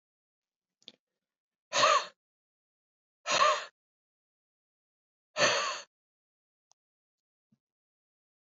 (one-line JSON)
{"exhalation_length": "8.5 s", "exhalation_amplitude": 8535, "exhalation_signal_mean_std_ratio": 0.27, "survey_phase": "beta (2021-08-13 to 2022-03-07)", "age": "18-44", "gender": "Female", "wearing_mask": "No", "symptom_cough_any": true, "symptom_runny_or_blocked_nose": true, "symptom_shortness_of_breath": true, "symptom_sore_throat": true, "symptom_diarrhoea": true, "symptom_fatigue": true, "symptom_headache": true, "smoker_status": "Ex-smoker", "respiratory_condition_asthma": false, "respiratory_condition_other": false, "recruitment_source": "Test and Trace", "submission_delay": "10 days", "covid_test_result": "Negative", "covid_test_method": "RT-qPCR"}